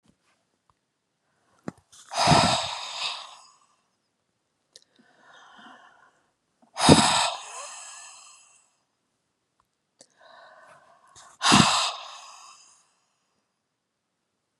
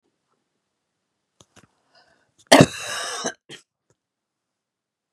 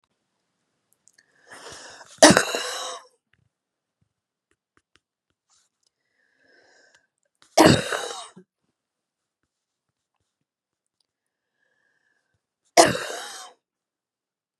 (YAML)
exhalation_length: 14.6 s
exhalation_amplitude: 32701
exhalation_signal_mean_std_ratio: 0.28
cough_length: 5.1 s
cough_amplitude: 32768
cough_signal_mean_std_ratio: 0.18
three_cough_length: 14.6 s
three_cough_amplitude: 32768
three_cough_signal_mean_std_ratio: 0.2
survey_phase: beta (2021-08-13 to 2022-03-07)
age: 65+
gender: Female
wearing_mask: 'No'
symptom_none: true
smoker_status: Ex-smoker
respiratory_condition_asthma: true
respiratory_condition_other: false
recruitment_source: REACT
submission_delay: 2 days
covid_test_result: Negative
covid_test_method: RT-qPCR
influenza_a_test_result: Negative
influenza_b_test_result: Negative